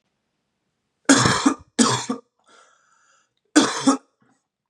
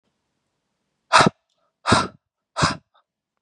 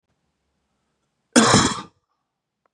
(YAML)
three_cough_length: 4.7 s
three_cough_amplitude: 31235
three_cough_signal_mean_std_ratio: 0.36
exhalation_length: 3.4 s
exhalation_amplitude: 29650
exhalation_signal_mean_std_ratio: 0.29
cough_length: 2.7 s
cough_amplitude: 32761
cough_signal_mean_std_ratio: 0.3
survey_phase: beta (2021-08-13 to 2022-03-07)
age: 18-44
gender: Male
wearing_mask: 'No'
symptom_new_continuous_cough: true
symptom_runny_or_blocked_nose: true
symptom_fatigue: true
symptom_headache: true
symptom_change_to_sense_of_smell_or_taste: true
symptom_loss_of_taste: true
symptom_onset: 6 days
smoker_status: Never smoked
respiratory_condition_asthma: false
respiratory_condition_other: false
recruitment_source: Test and Trace
submission_delay: 1 day
covid_test_result: Positive
covid_test_method: RT-qPCR
covid_ct_value: 31.0
covid_ct_gene: N gene